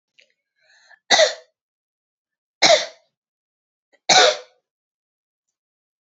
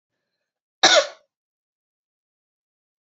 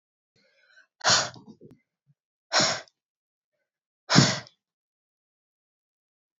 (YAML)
three_cough_length: 6.1 s
three_cough_amplitude: 31825
three_cough_signal_mean_std_ratio: 0.26
cough_length: 3.1 s
cough_amplitude: 26897
cough_signal_mean_std_ratio: 0.21
exhalation_length: 6.4 s
exhalation_amplitude: 25245
exhalation_signal_mean_std_ratio: 0.26
survey_phase: beta (2021-08-13 to 2022-03-07)
age: 18-44
gender: Female
wearing_mask: 'No'
symptom_none: true
symptom_onset: 12 days
smoker_status: Never smoked
respiratory_condition_asthma: true
respiratory_condition_other: false
recruitment_source: REACT
submission_delay: 1 day
covid_test_result: Negative
covid_test_method: RT-qPCR